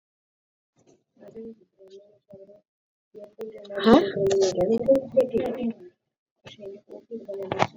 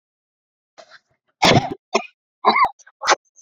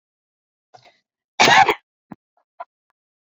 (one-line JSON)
{"exhalation_length": "7.8 s", "exhalation_amplitude": 26449, "exhalation_signal_mean_std_ratio": 0.42, "three_cough_length": "3.4 s", "three_cough_amplitude": 28663, "three_cough_signal_mean_std_ratio": 0.35, "cough_length": "3.2 s", "cough_amplitude": 29463, "cough_signal_mean_std_ratio": 0.25, "survey_phase": "beta (2021-08-13 to 2022-03-07)", "age": "18-44", "gender": "Female", "wearing_mask": "Yes", "symptom_none": true, "symptom_onset": "11 days", "smoker_status": "Never smoked", "respiratory_condition_asthma": true, "respiratory_condition_other": false, "recruitment_source": "REACT", "submission_delay": "2 days", "covid_test_result": "Negative", "covid_test_method": "RT-qPCR"}